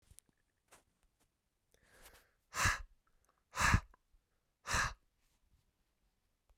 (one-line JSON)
{"exhalation_length": "6.6 s", "exhalation_amplitude": 5367, "exhalation_signal_mean_std_ratio": 0.26, "survey_phase": "beta (2021-08-13 to 2022-03-07)", "age": "45-64", "gender": "Male", "wearing_mask": "No", "symptom_cough_any": true, "symptom_runny_or_blocked_nose": true, "symptom_shortness_of_breath": true, "symptom_sore_throat": true, "symptom_fatigue": true, "symptom_headache": true, "smoker_status": "Never smoked", "respiratory_condition_asthma": false, "respiratory_condition_other": false, "recruitment_source": "Test and Trace", "submission_delay": "3 days", "covid_test_result": "Positive", "covid_test_method": "RT-qPCR", "covid_ct_value": 25.5, "covid_ct_gene": "ORF1ab gene"}